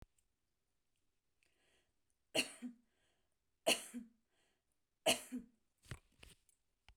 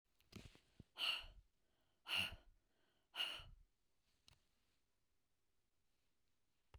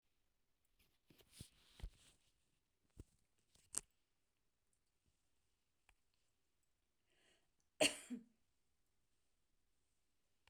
{"three_cough_length": "7.0 s", "three_cough_amplitude": 3786, "three_cough_signal_mean_std_ratio": 0.23, "exhalation_length": "6.8 s", "exhalation_amplitude": 1124, "exhalation_signal_mean_std_ratio": 0.31, "cough_length": "10.5 s", "cough_amplitude": 4116, "cough_signal_mean_std_ratio": 0.15, "survey_phase": "beta (2021-08-13 to 2022-03-07)", "age": "65+", "gender": "Female", "wearing_mask": "No", "symptom_none": true, "smoker_status": "Ex-smoker", "respiratory_condition_asthma": false, "respiratory_condition_other": false, "recruitment_source": "REACT", "submission_delay": "1 day", "covid_test_result": "Negative", "covid_test_method": "RT-qPCR", "influenza_a_test_result": "Negative", "influenza_b_test_result": "Negative"}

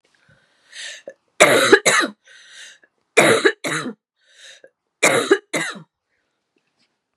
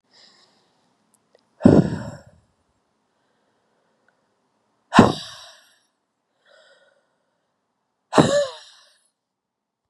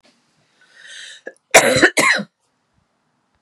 {"three_cough_length": "7.2 s", "three_cough_amplitude": 32768, "three_cough_signal_mean_std_ratio": 0.37, "exhalation_length": "9.9 s", "exhalation_amplitude": 32768, "exhalation_signal_mean_std_ratio": 0.22, "cough_length": "3.4 s", "cough_amplitude": 32768, "cough_signal_mean_std_ratio": 0.33, "survey_phase": "beta (2021-08-13 to 2022-03-07)", "age": "45-64", "gender": "Female", "wearing_mask": "No", "symptom_cough_any": true, "symptom_runny_or_blocked_nose": true, "symptom_sore_throat": true, "symptom_onset": "3 days", "smoker_status": "Never smoked", "respiratory_condition_asthma": true, "respiratory_condition_other": false, "recruitment_source": "Test and Trace", "submission_delay": "2 days", "covid_test_result": "Positive", "covid_test_method": "RT-qPCR", "covid_ct_value": 24.2, "covid_ct_gene": "N gene"}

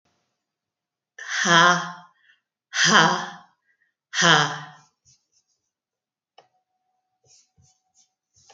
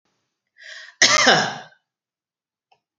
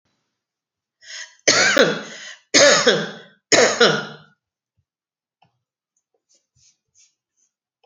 {"exhalation_length": "8.5 s", "exhalation_amplitude": 27596, "exhalation_signal_mean_std_ratio": 0.3, "cough_length": "3.0 s", "cough_amplitude": 29315, "cough_signal_mean_std_ratio": 0.33, "three_cough_length": "7.9 s", "three_cough_amplitude": 32767, "three_cough_signal_mean_std_ratio": 0.35, "survey_phase": "beta (2021-08-13 to 2022-03-07)", "age": "45-64", "gender": "Female", "wearing_mask": "No", "symptom_none": true, "smoker_status": "Never smoked", "respiratory_condition_asthma": false, "respiratory_condition_other": false, "recruitment_source": "REACT", "submission_delay": "0 days", "covid_test_result": "Negative", "covid_test_method": "RT-qPCR", "influenza_a_test_result": "Negative", "influenza_b_test_result": "Negative"}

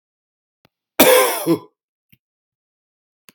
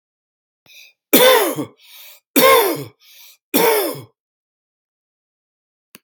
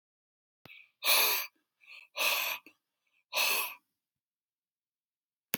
{"cough_length": "3.3 s", "cough_amplitude": 32768, "cough_signal_mean_std_ratio": 0.31, "three_cough_length": "6.0 s", "three_cough_amplitude": 32768, "three_cough_signal_mean_std_ratio": 0.38, "exhalation_length": "5.6 s", "exhalation_amplitude": 10647, "exhalation_signal_mean_std_ratio": 0.37, "survey_phase": "beta (2021-08-13 to 2022-03-07)", "age": "45-64", "gender": "Male", "wearing_mask": "No", "symptom_none": true, "smoker_status": "Current smoker (1 to 10 cigarettes per day)", "respiratory_condition_asthma": false, "respiratory_condition_other": false, "recruitment_source": "REACT", "submission_delay": "2 days", "covid_test_result": "Negative", "covid_test_method": "RT-qPCR"}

